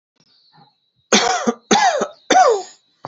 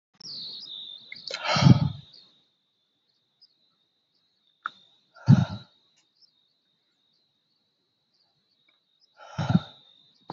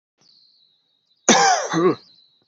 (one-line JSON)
{"three_cough_length": "3.1 s", "three_cough_amplitude": 30843, "three_cough_signal_mean_std_ratio": 0.49, "exhalation_length": "10.3 s", "exhalation_amplitude": 22590, "exhalation_signal_mean_std_ratio": 0.23, "cough_length": "2.5 s", "cough_amplitude": 31620, "cough_signal_mean_std_ratio": 0.41, "survey_phase": "beta (2021-08-13 to 2022-03-07)", "age": "18-44", "gender": "Male", "wearing_mask": "No", "symptom_none": true, "smoker_status": "Never smoked", "respiratory_condition_asthma": false, "respiratory_condition_other": false, "recruitment_source": "REACT", "submission_delay": "1 day", "covid_test_result": "Negative", "covid_test_method": "RT-qPCR", "influenza_a_test_result": "Negative", "influenza_b_test_result": "Negative"}